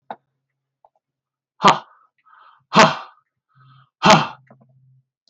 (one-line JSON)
{"exhalation_length": "5.3 s", "exhalation_amplitude": 32768, "exhalation_signal_mean_std_ratio": 0.26, "survey_phase": "beta (2021-08-13 to 2022-03-07)", "age": "65+", "gender": "Male", "wearing_mask": "No", "symptom_none": true, "smoker_status": "Never smoked", "respiratory_condition_asthma": false, "respiratory_condition_other": false, "recruitment_source": "REACT", "submission_delay": "1 day", "covid_test_result": "Negative", "covid_test_method": "RT-qPCR"}